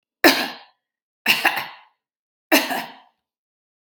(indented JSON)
{
  "three_cough_length": "3.9 s",
  "three_cough_amplitude": 32767,
  "three_cough_signal_mean_std_ratio": 0.33,
  "survey_phase": "beta (2021-08-13 to 2022-03-07)",
  "age": "45-64",
  "gender": "Female",
  "wearing_mask": "No",
  "symptom_none": true,
  "symptom_onset": "6 days",
  "smoker_status": "Ex-smoker",
  "respiratory_condition_asthma": false,
  "respiratory_condition_other": false,
  "recruitment_source": "REACT",
  "submission_delay": "2 days",
  "covid_test_result": "Negative",
  "covid_test_method": "RT-qPCR",
  "influenza_a_test_result": "Negative",
  "influenza_b_test_result": "Negative"
}